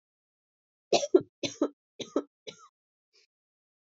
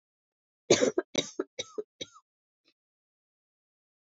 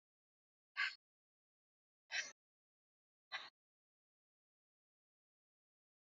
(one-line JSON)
{"three_cough_length": "3.9 s", "three_cough_amplitude": 12369, "three_cough_signal_mean_std_ratio": 0.22, "cough_length": "4.1 s", "cough_amplitude": 14040, "cough_signal_mean_std_ratio": 0.23, "exhalation_length": "6.1 s", "exhalation_amplitude": 1368, "exhalation_signal_mean_std_ratio": 0.19, "survey_phase": "alpha (2021-03-01 to 2021-08-12)", "age": "18-44", "gender": "Female", "wearing_mask": "No", "symptom_cough_any": true, "symptom_fatigue": true, "symptom_fever_high_temperature": true, "symptom_headache": true, "symptom_change_to_sense_of_smell_or_taste": true, "symptom_loss_of_taste": true, "symptom_onset": "3 days", "smoker_status": "Ex-smoker", "respiratory_condition_asthma": false, "respiratory_condition_other": false, "recruitment_source": "Test and Trace", "submission_delay": "2 days", "covid_test_result": "Positive", "covid_test_method": "RT-qPCR"}